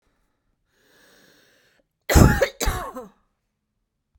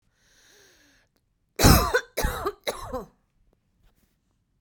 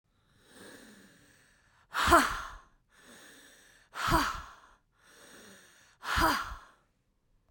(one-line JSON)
{"cough_length": "4.2 s", "cough_amplitude": 32768, "cough_signal_mean_std_ratio": 0.26, "three_cough_length": "4.6 s", "three_cough_amplitude": 25025, "three_cough_signal_mean_std_ratio": 0.3, "exhalation_length": "7.5 s", "exhalation_amplitude": 13170, "exhalation_signal_mean_std_ratio": 0.34, "survey_phase": "beta (2021-08-13 to 2022-03-07)", "age": "45-64", "gender": "Female", "wearing_mask": "No", "symptom_none": true, "smoker_status": "Never smoked", "respiratory_condition_asthma": false, "respiratory_condition_other": true, "recruitment_source": "REACT", "submission_delay": "1 day", "covid_test_result": "Negative", "covid_test_method": "RT-qPCR"}